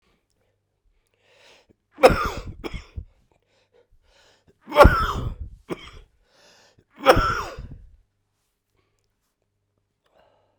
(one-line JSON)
{"three_cough_length": "10.6 s", "three_cough_amplitude": 32768, "three_cough_signal_mean_std_ratio": 0.25, "survey_phase": "beta (2021-08-13 to 2022-03-07)", "age": "65+", "gender": "Male", "wearing_mask": "No", "symptom_cough_any": true, "symptom_new_continuous_cough": true, "symptom_runny_or_blocked_nose": true, "symptom_headache": true, "symptom_onset": "6 days", "smoker_status": "Never smoked", "respiratory_condition_asthma": false, "respiratory_condition_other": false, "recruitment_source": "Test and Trace", "submission_delay": "1 day", "covid_test_result": "Positive", "covid_test_method": "RT-qPCR"}